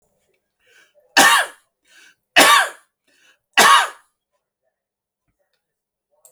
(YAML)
three_cough_length: 6.3 s
three_cough_amplitude: 32476
three_cough_signal_mean_std_ratio: 0.31
survey_phase: alpha (2021-03-01 to 2021-08-12)
age: 65+
gender: Male
wearing_mask: 'No'
symptom_abdominal_pain: true
smoker_status: Never smoked
respiratory_condition_asthma: false
respiratory_condition_other: false
recruitment_source: REACT
submission_delay: 8 days
covid_test_result: Negative
covid_test_method: RT-qPCR